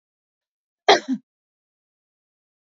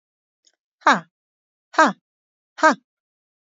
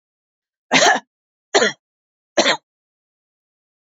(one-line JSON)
{"cough_length": "2.6 s", "cough_amplitude": 28195, "cough_signal_mean_std_ratio": 0.19, "exhalation_length": "3.6 s", "exhalation_amplitude": 27754, "exhalation_signal_mean_std_ratio": 0.22, "three_cough_length": "3.8 s", "three_cough_amplitude": 30115, "three_cough_signal_mean_std_ratio": 0.31, "survey_phase": "beta (2021-08-13 to 2022-03-07)", "age": "45-64", "gender": "Female", "wearing_mask": "No", "symptom_none": true, "smoker_status": "Never smoked", "respiratory_condition_asthma": false, "respiratory_condition_other": false, "recruitment_source": "REACT", "submission_delay": "1 day", "covid_test_result": "Negative", "covid_test_method": "RT-qPCR"}